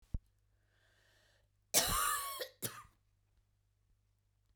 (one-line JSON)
{"three_cough_length": "4.6 s", "three_cough_amplitude": 7924, "three_cough_signal_mean_std_ratio": 0.33, "survey_phase": "beta (2021-08-13 to 2022-03-07)", "age": "45-64", "gender": "Female", "wearing_mask": "No", "symptom_none": true, "smoker_status": "Never smoked", "respiratory_condition_asthma": false, "respiratory_condition_other": false, "recruitment_source": "REACT", "submission_delay": "2 days", "covid_test_result": "Negative", "covid_test_method": "RT-qPCR", "influenza_a_test_result": "Negative", "influenza_b_test_result": "Negative"}